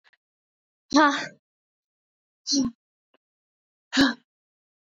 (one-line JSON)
{"exhalation_length": "4.9 s", "exhalation_amplitude": 17063, "exhalation_signal_mean_std_ratio": 0.29, "survey_phase": "beta (2021-08-13 to 2022-03-07)", "age": "18-44", "gender": "Female", "wearing_mask": "No", "symptom_cough_any": true, "symptom_new_continuous_cough": true, "symptom_runny_or_blocked_nose": true, "symptom_sore_throat": true, "symptom_fatigue": true, "symptom_headache": true, "symptom_onset": "12 days", "smoker_status": "Never smoked", "respiratory_condition_asthma": false, "respiratory_condition_other": false, "recruitment_source": "REACT", "submission_delay": "1 day", "covid_test_result": "Negative", "covid_test_method": "RT-qPCR", "influenza_a_test_result": "Unknown/Void", "influenza_b_test_result": "Unknown/Void"}